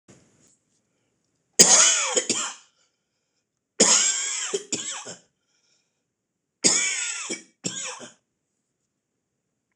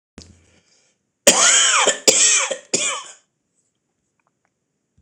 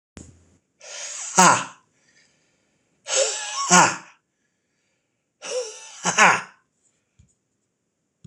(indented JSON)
{
  "three_cough_length": "9.8 s",
  "three_cough_amplitude": 26028,
  "three_cough_signal_mean_std_ratio": 0.36,
  "cough_length": "5.0 s",
  "cough_amplitude": 26028,
  "cough_signal_mean_std_ratio": 0.42,
  "exhalation_length": "8.3 s",
  "exhalation_amplitude": 26028,
  "exhalation_signal_mean_std_ratio": 0.32,
  "survey_phase": "alpha (2021-03-01 to 2021-08-12)",
  "age": "45-64",
  "gender": "Male",
  "wearing_mask": "No",
  "symptom_cough_any": true,
  "symptom_shortness_of_breath": true,
  "symptom_onset": "4 days",
  "smoker_status": "Ex-smoker",
  "respiratory_condition_asthma": false,
  "respiratory_condition_other": false,
  "recruitment_source": "REACT",
  "submission_delay": "2 days",
  "covid_test_result": "Negative",
  "covid_test_method": "RT-qPCR"
}